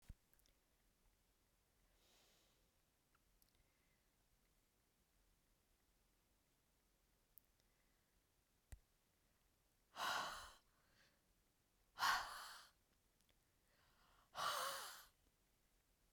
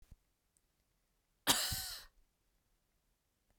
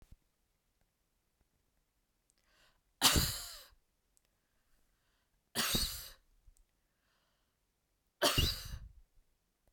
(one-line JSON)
{"exhalation_length": "16.1 s", "exhalation_amplitude": 1359, "exhalation_signal_mean_std_ratio": 0.27, "cough_length": "3.6 s", "cough_amplitude": 7391, "cough_signal_mean_std_ratio": 0.26, "three_cough_length": "9.7 s", "three_cough_amplitude": 7213, "three_cough_signal_mean_std_ratio": 0.28, "survey_phase": "beta (2021-08-13 to 2022-03-07)", "age": "45-64", "gender": "Female", "wearing_mask": "No", "symptom_none": true, "smoker_status": "Never smoked", "respiratory_condition_asthma": false, "respiratory_condition_other": false, "recruitment_source": "REACT", "submission_delay": "2 days", "covid_test_result": "Negative", "covid_test_method": "RT-qPCR", "influenza_a_test_result": "Unknown/Void", "influenza_b_test_result": "Unknown/Void"}